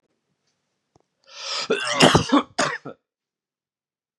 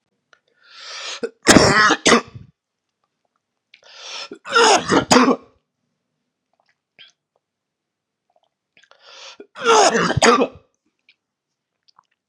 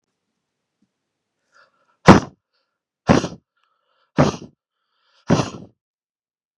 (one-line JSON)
{"cough_length": "4.2 s", "cough_amplitude": 32538, "cough_signal_mean_std_ratio": 0.35, "three_cough_length": "12.3 s", "three_cough_amplitude": 32768, "three_cough_signal_mean_std_ratio": 0.35, "exhalation_length": "6.6 s", "exhalation_amplitude": 32768, "exhalation_signal_mean_std_ratio": 0.21, "survey_phase": "beta (2021-08-13 to 2022-03-07)", "age": "18-44", "gender": "Male", "wearing_mask": "No", "symptom_cough_any": true, "symptom_new_continuous_cough": true, "symptom_runny_or_blocked_nose": true, "symptom_shortness_of_breath": true, "symptom_sore_throat": true, "symptom_fatigue": true, "symptom_change_to_sense_of_smell_or_taste": true, "symptom_loss_of_taste": true, "symptom_onset": "9 days", "smoker_status": "Never smoked", "respiratory_condition_asthma": false, "respiratory_condition_other": false, "recruitment_source": "Test and Trace", "submission_delay": "2 days", "covid_test_result": "Positive", "covid_test_method": "RT-qPCR", "covid_ct_value": 20.7, "covid_ct_gene": "ORF1ab gene"}